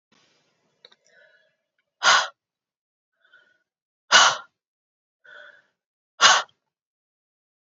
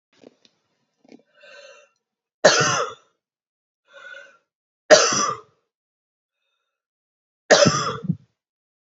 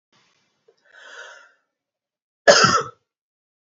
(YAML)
exhalation_length: 7.7 s
exhalation_amplitude: 29340
exhalation_signal_mean_std_ratio: 0.23
three_cough_length: 9.0 s
three_cough_amplitude: 32767
three_cough_signal_mean_std_ratio: 0.28
cough_length: 3.7 s
cough_amplitude: 27881
cough_signal_mean_std_ratio: 0.25
survey_phase: beta (2021-08-13 to 2022-03-07)
age: 18-44
gender: Female
wearing_mask: 'No'
symptom_none: true
symptom_onset: 12 days
smoker_status: Never smoked
respiratory_condition_asthma: false
respiratory_condition_other: false
recruitment_source: REACT
submission_delay: 2 days
covid_test_result: Negative
covid_test_method: RT-qPCR